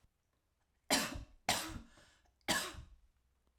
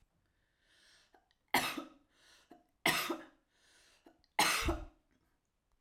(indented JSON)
{
  "cough_length": "3.6 s",
  "cough_amplitude": 4095,
  "cough_signal_mean_std_ratio": 0.37,
  "three_cough_length": "5.8 s",
  "three_cough_amplitude": 5299,
  "three_cough_signal_mean_std_ratio": 0.33,
  "survey_phase": "alpha (2021-03-01 to 2021-08-12)",
  "age": "45-64",
  "gender": "Female",
  "wearing_mask": "No",
  "symptom_none": true,
  "smoker_status": "Prefer not to say",
  "respiratory_condition_asthma": false,
  "respiratory_condition_other": false,
  "recruitment_source": "REACT",
  "submission_delay": "1 day",
  "covid_test_result": "Negative",
  "covid_test_method": "RT-qPCR"
}